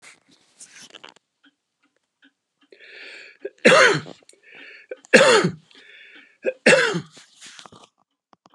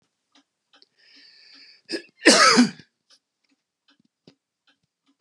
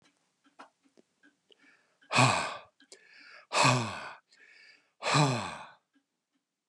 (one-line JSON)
{"three_cough_length": "8.5 s", "three_cough_amplitude": 32242, "three_cough_signal_mean_std_ratio": 0.3, "cough_length": "5.2 s", "cough_amplitude": 31248, "cough_signal_mean_std_ratio": 0.25, "exhalation_length": "6.7 s", "exhalation_amplitude": 11098, "exhalation_signal_mean_std_ratio": 0.36, "survey_phase": "beta (2021-08-13 to 2022-03-07)", "age": "65+", "gender": "Male", "wearing_mask": "No", "symptom_none": true, "smoker_status": "Never smoked", "respiratory_condition_asthma": false, "respiratory_condition_other": false, "recruitment_source": "REACT", "submission_delay": "1 day", "covid_test_result": "Negative", "covid_test_method": "RT-qPCR"}